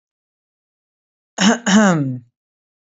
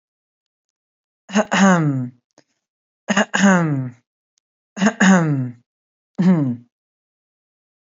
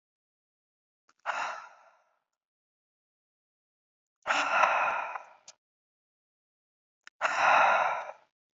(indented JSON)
{
  "cough_length": "2.8 s",
  "cough_amplitude": 28222,
  "cough_signal_mean_std_ratio": 0.4,
  "three_cough_length": "7.9 s",
  "three_cough_amplitude": 28086,
  "three_cough_signal_mean_std_ratio": 0.45,
  "exhalation_length": "8.5 s",
  "exhalation_amplitude": 11538,
  "exhalation_signal_mean_std_ratio": 0.37,
  "survey_phase": "beta (2021-08-13 to 2022-03-07)",
  "age": "18-44",
  "gender": "Male",
  "wearing_mask": "No",
  "symptom_none": true,
  "smoker_status": "Never smoked",
  "respiratory_condition_asthma": false,
  "respiratory_condition_other": false,
  "recruitment_source": "REACT",
  "submission_delay": "1 day",
  "covid_test_result": "Negative",
  "covid_test_method": "RT-qPCR",
  "influenza_a_test_result": "Negative",
  "influenza_b_test_result": "Negative"
}